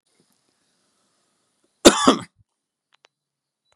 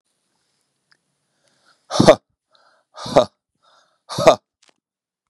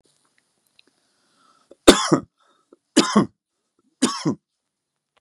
{"cough_length": "3.8 s", "cough_amplitude": 32768, "cough_signal_mean_std_ratio": 0.19, "exhalation_length": "5.3 s", "exhalation_amplitude": 32768, "exhalation_signal_mean_std_ratio": 0.22, "three_cough_length": "5.2 s", "three_cough_amplitude": 32768, "three_cough_signal_mean_std_ratio": 0.25, "survey_phase": "beta (2021-08-13 to 2022-03-07)", "age": "45-64", "gender": "Male", "wearing_mask": "No", "symptom_cough_any": true, "symptom_sore_throat": true, "symptom_onset": "5 days", "smoker_status": "Never smoked", "respiratory_condition_asthma": false, "respiratory_condition_other": false, "recruitment_source": "Test and Trace", "submission_delay": "2 days", "covid_test_result": "Positive", "covid_test_method": "RT-qPCR", "covid_ct_value": 24.4, "covid_ct_gene": "ORF1ab gene"}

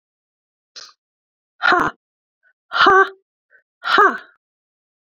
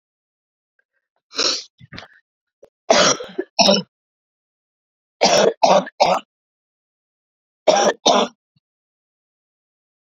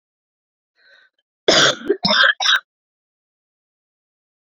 {"exhalation_length": "5.0 s", "exhalation_amplitude": 28860, "exhalation_signal_mean_std_ratio": 0.32, "three_cough_length": "10.1 s", "three_cough_amplitude": 32768, "three_cough_signal_mean_std_ratio": 0.35, "cough_length": "4.5 s", "cough_amplitude": 28178, "cough_signal_mean_std_ratio": 0.34, "survey_phase": "beta (2021-08-13 to 2022-03-07)", "age": "65+", "gender": "Female", "wearing_mask": "No", "symptom_cough_any": true, "symptom_onset": "3 days", "smoker_status": "Never smoked", "respiratory_condition_asthma": false, "respiratory_condition_other": false, "recruitment_source": "Test and Trace", "submission_delay": "2 days", "covid_test_result": "Positive", "covid_test_method": "RT-qPCR"}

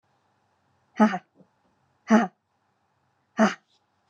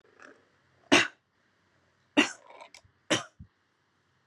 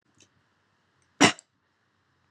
{"exhalation_length": "4.1 s", "exhalation_amplitude": 20794, "exhalation_signal_mean_std_ratio": 0.25, "three_cough_length": "4.3 s", "three_cough_amplitude": 15820, "three_cough_signal_mean_std_ratio": 0.23, "cough_length": "2.3 s", "cough_amplitude": 20896, "cough_signal_mean_std_ratio": 0.17, "survey_phase": "beta (2021-08-13 to 2022-03-07)", "age": "18-44", "gender": "Female", "wearing_mask": "No", "symptom_none": true, "smoker_status": "Never smoked", "respiratory_condition_asthma": true, "respiratory_condition_other": false, "recruitment_source": "REACT", "submission_delay": "1 day", "covid_test_result": "Negative", "covid_test_method": "RT-qPCR", "influenza_a_test_result": "Negative", "influenza_b_test_result": "Negative"}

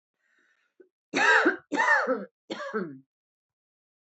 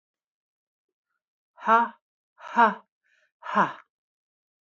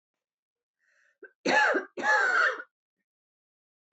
{"three_cough_length": "4.2 s", "three_cough_amplitude": 12410, "three_cough_signal_mean_std_ratio": 0.42, "exhalation_length": "4.6 s", "exhalation_amplitude": 18357, "exhalation_signal_mean_std_ratio": 0.27, "cough_length": "3.9 s", "cough_amplitude": 8568, "cough_signal_mean_std_ratio": 0.42, "survey_phase": "beta (2021-08-13 to 2022-03-07)", "age": "45-64", "gender": "Female", "wearing_mask": "No", "symptom_none": true, "smoker_status": "Ex-smoker", "respiratory_condition_asthma": true, "respiratory_condition_other": false, "recruitment_source": "REACT", "submission_delay": "2 days", "covid_test_result": "Negative", "covid_test_method": "RT-qPCR", "influenza_a_test_result": "Negative", "influenza_b_test_result": "Negative"}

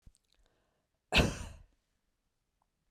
{"cough_length": "2.9 s", "cough_amplitude": 7194, "cough_signal_mean_std_ratio": 0.23, "survey_phase": "beta (2021-08-13 to 2022-03-07)", "age": "65+", "gender": "Female", "wearing_mask": "No", "symptom_none": true, "smoker_status": "Never smoked", "respiratory_condition_asthma": false, "respiratory_condition_other": false, "recruitment_source": "REACT", "submission_delay": "2 days", "covid_test_result": "Negative", "covid_test_method": "RT-qPCR", "influenza_a_test_result": "Unknown/Void", "influenza_b_test_result": "Unknown/Void"}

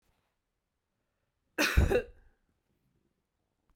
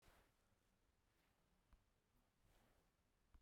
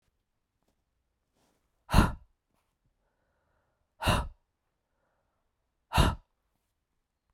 {"cough_length": "3.8 s", "cough_amplitude": 9179, "cough_signal_mean_std_ratio": 0.26, "three_cough_length": "3.4 s", "three_cough_amplitude": 38, "three_cough_signal_mean_std_ratio": 0.75, "exhalation_length": "7.3 s", "exhalation_amplitude": 15945, "exhalation_signal_mean_std_ratio": 0.22, "survey_phase": "beta (2021-08-13 to 2022-03-07)", "age": "45-64", "gender": "Female", "wearing_mask": "No", "symptom_cough_any": true, "symptom_runny_or_blocked_nose": true, "symptom_abdominal_pain": true, "symptom_fatigue": true, "symptom_fever_high_temperature": true, "symptom_headache": true, "smoker_status": "Ex-smoker", "respiratory_condition_asthma": false, "respiratory_condition_other": false, "recruitment_source": "Test and Trace", "submission_delay": "2 days", "covid_test_result": "Positive", "covid_test_method": "RT-qPCR", "covid_ct_value": 15.9, "covid_ct_gene": "ORF1ab gene", "covid_ct_mean": 16.7, "covid_viral_load": "3200000 copies/ml", "covid_viral_load_category": "High viral load (>1M copies/ml)"}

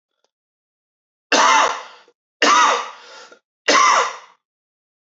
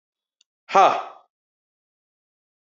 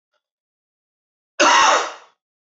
{"three_cough_length": "5.1 s", "three_cough_amplitude": 26779, "three_cough_signal_mean_std_ratio": 0.43, "exhalation_length": "2.7 s", "exhalation_amplitude": 24934, "exhalation_signal_mean_std_ratio": 0.23, "cough_length": "2.6 s", "cough_amplitude": 25448, "cough_signal_mean_std_ratio": 0.36, "survey_phase": "beta (2021-08-13 to 2022-03-07)", "age": "18-44", "gender": "Male", "wearing_mask": "No", "symptom_runny_or_blocked_nose": true, "symptom_diarrhoea": true, "symptom_fatigue": true, "symptom_headache": true, "symptom_change_to_sense_of_smell_or_taste": true, "smoker_status": "Ex-smoker", "respiratory_condition_asthma": false, "respiratory_condition_other": false, "recruitment_source": "Test and Trace", "submission_delay": "2 days", "covid_test_result": "Positive", "covid_test_method": "LAMP"}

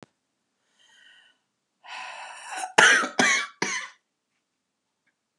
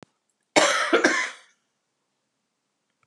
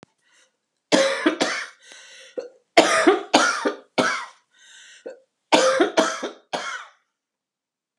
{"exhalation_length": "5.4 s", "exhalation_amplitude": 32767, "exhalation_signal_mean_std_ratio": 0.32, "cough_length": "3.1 s", "cough_amplitude": 26200, "cough_signal_mean_std_ratio": 0.37, "three_cough_length": "8.0 s", "three_cough_amplitude": 32767, "three_cough_signal_mean_std_ratio": 0.44, "survey_phase": "beta (2021-08-13 to 2022-03-07)", "age": "65+", "gender": "Female", "wearing_mask": "No", "symptom_cough_any": true, "symptom_new_continuous_cough": true, "symptom_sore_throat": true, "symptom_fatigue": true, "symptom_headache": true, "symptom_onset": "5 days", "smoker_status": "Never smoked", "respiratory_condition_asthma": false, "respiratory_condition_other": false, "recruitment_source": "Test and Trace", "submission_delay": "1 day", "covid_test_result": "Positive", "covid_test_method": "RT-qPCR", "covid_ct_value": 21.4, "covid_ct_gene": "ORF1ab gene", "covid_ct_mean": 21.7, "covid_viral_load": "79000 copies/ml", "covid_viral_load_category": "Low viral load (10K-1M copies/ml)"}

